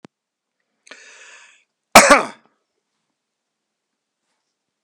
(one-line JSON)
{"cough_length": "4.8 s", "cough_amplitude": 32768, "cough_signal_mean_std_ratio": 0.18, "survey_phase": "beta (2021-08-13 to 2022-03-07)", "age": "65+", "gender": "Male", "wearing_mask": "No", "symptom_none": true, "smoker_status": "Never smoked", "respiratory_condition_asthma": false, "respiratory_condition_other": false, "recruitment_source": "REACT", "submission_delay": "2 days", "covid_test_result": "Negative", "covid_test_method": "RT-qPCR"}